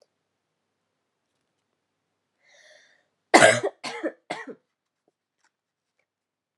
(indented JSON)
{
  "cough_length": "6.6 s",
  "cough_amplitude": 31918,
  "cough_signal_mean_std_ratio": 0.19,
  "survey_phase": "alpha (2021-03-01 to 2021-08-12)",
  "age": "18-44",
  "gender": "Female",
  "wearing_mask": "No",
  "symptom_headache": true,
  "symptom_change_to_sense_of_smell_or_taste": true,
  "symptom_loss_of_taste": true,
  "symptom_onset": "2 days",
  "smoker_status": "Never smoked",
  "respiratory_condition_asthma": false,
  "respiratory_condition_other": false,
  "recruitment_source": "Test and Trace",
  "submission_delay": "1 day",
  "covid_test_result": "Positive",
  "covid_test_method": "RT-qPCR",
  "covid_ct_value": 16.1,
  "covid_ct_gene": "N gene",
  "covid_ct_mean": 16.9,
  "covid_viral_load": "2800000 copies/ml",
  "covid_viral_load_category": "High viral load (>1M copies/ml)"
}